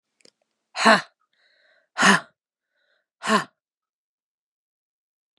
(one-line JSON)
{"exhalation_length": "5.4 s", "exhalation_amplitude": 29707, "exhalation_signal_mean_std_ratio": 0.25, "survey_phase": "beta (2021-08-13 to 2022-03-07)", "age": "45-64", "gender": "Female", "wearing_mask": "No", "symptom_cough_any": true, "symptom_runny_or_blocked_nose": true, "symptom_shortness_of_breath": true, "symptom_fatigue": true, "symptom_headache": true, "symptom_change_to_sense_of_smell_or_taste": true, "symptom_other": true, "symptom_onset": "7 days", "smoker_status": "Ex-smoker", "respiratory_condition_asthma": false, "respiratory_condition_other": false, "recruitment_source": "Test and Trace", "submission_delay": "1 day", "covid_test_result": "Positive", "covid_test_method": "RT-qPCR", "covid_ct_value": 24.9, "covid_ct_gene": "ORF1ab gene"}